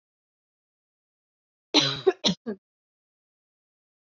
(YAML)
cough_length: 4.0 s
cough_amplitude: 15435
cough_signal_mean_std_ratio: 0.24
survey_phase: beta (2021-08-13 to 2022-03-07)
age: 18-44
gender: Female
wearing_mask: 'No'
symptom_cough_any: true
symptom_runny_or_blocked_nose: true
symptom_fatigue: true
symptom_fever_high_temperature: true
symptom_headache: true
symptom_change_to_sense_of_smell_or_taste: true
symptom_other: true
smoker_status: Never smoked
respiratory_condition_asthma: false
respiratory_condition_other: false
recruitment_source: Test and Trace
submission_delay: 2 days
covid_test_result: Positive
covid_test_method: RT-qPCR
covid_ct_value: 16.3
covid_ct_gene: ORF1ab gene
covid_ct_mean: 16.7
covid_viral_load: 3400000 copies/ml
covid_viral_load_category: High viral load (>1M copies/ml)